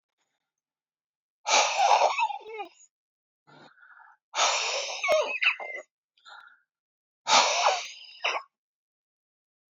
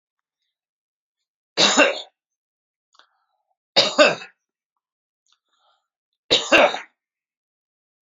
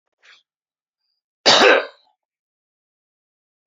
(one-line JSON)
{"exhalation_length": "9.7 s", "exhalation_amplitude": 17159, "exhalation_signal_mean_std_ratio": 0.44, "three_cough_length": "8.2 s", "three_cough_amplitude": 32767, "three_cough_signal_mean_std_ratio": 0.27, "cough_length": "3.7 s", "cough_amplitude": 31203, "cough_signal_mean_std_ratio": 0.25, "survey_phase": "beta (2021-08-13 to 2022-03-07)", "age": "65+", "gender": "Male", "wearing_mask": "No", "symptom_none": true, "smoker_status": "Ex-smoker", "respiratory_condition_asthma": false, "respiratory_condition_other": false, "recruitment_source": "REACT", "submission_delay": "1 day", "covid_test_result": "Negative", "covid_test_method": "RT-qPCR"}